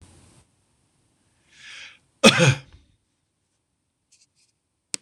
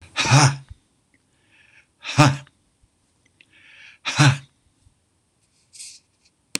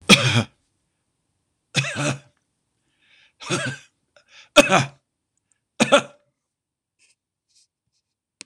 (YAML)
cough_length: 5.0 s
cough_amplitude: 26028
cough_signal_mean_std_ratio: 0.2
exhalation_length: 6.6 s
exhalation_amplitude: 26028
exhalation_signal_mean_std_ratio: 0.29
three_cough_length: 8.5 s
three_cough_amplitude: 26028
three_cough_signal_mean_std_ratio: 0.27
survey_phase: beta (2021-08-13 to 2022-03-07)
age: 65+
gender: Male
wearing_mask: 'No'
symptom_runny_or_blocked_nose: true
smoker_status: Ex-smoker
respiratory_condition_asthma: false
respiratory_condition_other: false
recruitment_source: REACT
submission_delay: 2 days
covid_test_result: Negative
covid_test_method: RT-qPCR
influenza_a_test_result: Negative
influenza_b_test_result: Negative